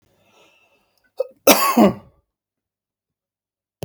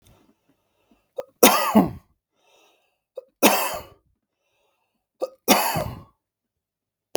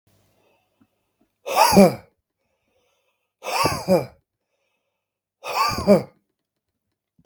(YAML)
cough_length: 3.8 s
cough_amplitude: 32768
cough_signal_mean_std_ratio: 0.27
three_cough_length: 7.2 s
three_cough_amplitude: 32768
three_cough_signal_mean_std_ratio: 0.3
exhalation_length: 7.3 s
exhalation_amplitude: 32766
exhalation_signal_mean_std_ratio: 0.31
survey_phase: beta (2021-08-13 to 2022-03-07)
age: 45-64
gender: Male
wearing_mask: 'No'
symptom_fatigue: true
smoker_status: Never smoked
respiratory_condition_asthma: false
respiratory_condition_other: false
recruitment_source: REACT
submission_delay: 1 day
covid_test_result: Negative
covid_test_method: RT-qPCR
influenza_a_test_result: Negative
influenza_b_test_result: Negative